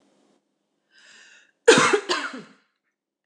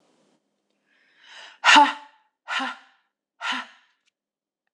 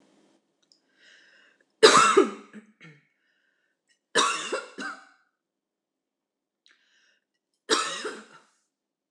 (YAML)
cough_length: 3.3 s
cough_amplitude: 25821
cough_signal_mean_std_ratio: 0.29
exhalation_length: 4.7 s
exhalation_amplitude: 26027
exhalation_signal_mean_std_ratio: 0.26
three_cough_length: 9.1 s
three_cough_amplitude: 25928
three_cough_signal_mean_std_ratio: 0.26
survey_phase: beta (2021-08-13 to 2022-03-07)
age: 45-64
gender: Female
wearing_mask: 'No'
symptom_sore_throat: true
symptom_headache: true
symptom_onset: 6 days
smoker_status: Never smoked
respiratory_condition_asthma: false
respiratory_condition_other: false
recruitment_source: REACT
submission_delay: 2 days
covid_test_result: Negative
covid_test_method: RT-qPCR